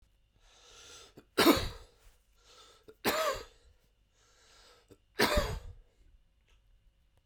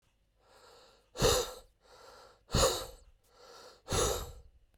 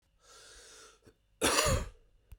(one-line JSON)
{"three_cough_length": "7.3 s", "three_cough_amplitude": 8427, "three_cough_signal_mean_std_ratio": 0.31, "exhalation_length": "4.8 s", "exhalation_amplitude": 6418, "exhalation_signal_mean_std_ratio": 0.39, "cough_length": "2.4 s", "cough_amplitude": 9934, "cough_signal_mean_std_ratio": 0.39, "survey_phase": "beta (2021-08-13 to 2022-03-07)", "age": "45-64", "gender": "Male", "wearing_mask": "No", "symptom_cough_any": true, "symptom_runny_or_blocked_nose": true, "symptom_fatigue": true, "symptom_change_to_sense_of_smell_or_taste": true, "symptom_loss_of_taste": true, "symptom_onset": "5 days", "smoker_status": "Never smoked", "respiratory_condition_asthma": false, "respiratory_condition_other": false, "recruitment_source": "Test and Trace", "submission_delay": "2 days", "covid_test_result": "Positive", "covid_test_method": "RT-qPCR", "covid_ct_value": 18.3, "covid_ct_gene": "ORF1ab gene", "covid_ct_mean": 19.2, "covid_viral_load": "500000 copies/ml", "covid_viral_load_category": "Low viral load (10K-1M copies/ml)"}